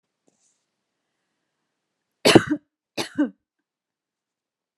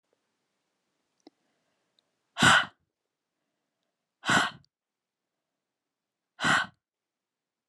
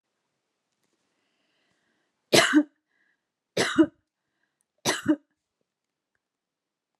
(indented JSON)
{
  "cough_length": "4.8 s",
  "cough_amplitude": 32767,
  "cough_signal_mean_std_ratio": 0.19,
  "exhalation_length": "7.7 s",
  "exhalation_amplitude": 15068,
  "exhalation_signal_mean_std_ratio": 0.23,
  "three_cough_length": "7.0 s",
  "three_cough_amplitude": 20852,
  "three_cough_signal_mean_std_ratio": 0.24,
  "survey_phase": "beta (2021-08-13 to 2022-03-07)",
  "age": "18-44",
  "gender": "Female",
  "wearing_mask": "No",
  "symptom_none": true,
  "smoker_status": "Never smoked",
  "respiratory_condition_asthma": false,
  "respiratory_condition_other": false,
  "recruitment_source": "REACT",
  "submission_delay": "1 day",
  "covid_test_result": "Negative",
  "covid_test_method": "RT-qPCR",
  "influenza_a_test_result": "Negative",
  "influenza_b_test_result": "Negative"
}